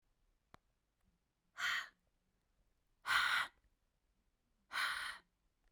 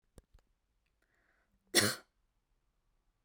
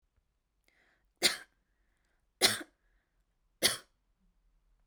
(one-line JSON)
{"exhalation_length": "5.7 s", "exhalation_amplitude": 3385, "exhalation_signal_mean_std_ratio": 0.35, "cough_length": "3.2 s", "cough_amplitude": 8812, "cough_signal_mean_std_ratio": 0.19, "three_cough_length": "4.9 s", "three_cough_amplitude": 10905, "three_cough_signal_mean_std_ratio": 0.22, "survey_phase": "beta (2021-08-13 to 2022-03-07)", "age": "18-44", "gender": "Female", "wearing_mask": "No", "symptom_runny_or_blocked_nose": true, "smoker_status": "Ex-smoker", "respiratory_condition_asthma": false, "respiratory_condition_other": false, "recruitment_source": "REACT", "submission_delay": "1 day", "covid_test_result": "Negative", "covid_test_method": "RT-qPCR"}